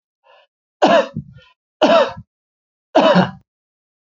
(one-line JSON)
{"three_cough_length": "4.2 s", "three_cough_amplitude": 32767, "three_cough_signal_mean_std_ratio": 0.39, "survey_phase": "alpha (2021-03-01 to 2021-08-12)", "age": "45-64", "gender": "Male", "wearing_mask": "No", "symptom_none": true, "smoker_status": "Current smoker (1 to 10 cigarettes per day)", "respiratory_condition_asthma": false, "respiratory_condition_other": false, "recruitment_source": "REACT", "submission_delay": "7 days", "covid_test_result": "Negative", "covid_test_method": "RT-qPCR"}